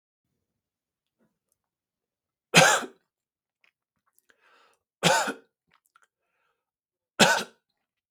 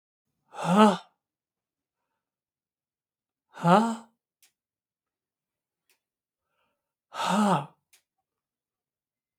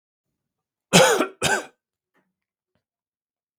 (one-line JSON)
{"three_cough_length": "8.1 s", "three_cough_amplitude": 32766, "three_cough_signal_mean_std_ratio": 0.23, "exhalation_length": "9.4 s", "exhalation_amplitude": 20476, "exhalation_signal_mean_std_ratio": 0.25, "cough_length": "3.6 s", "cough_amplitude": 32766, "cough_signal_mean_std_ratio": 0.28, "survey_phase": "beta (2021-08-13 to 2022-03-07)", "age": "45-64", "gender": "Male", "wearing_mask": "No", "symptom_cough_any": true, "symptom_sore_throat": true, "symptom_abdominal_pain": true, "symptom_fatigue": true, "symptom_change_to_sense_of_smell_or_taste": true, "smoker_status": "Never smoked", "respiratory_condition_asthma": false, "respiratory_condition_other": false, "recruitment_source": "Test and Trace", "submission_delay": "2 days", "covid_test_result": "Positive", "covid_test_method": "LFT"}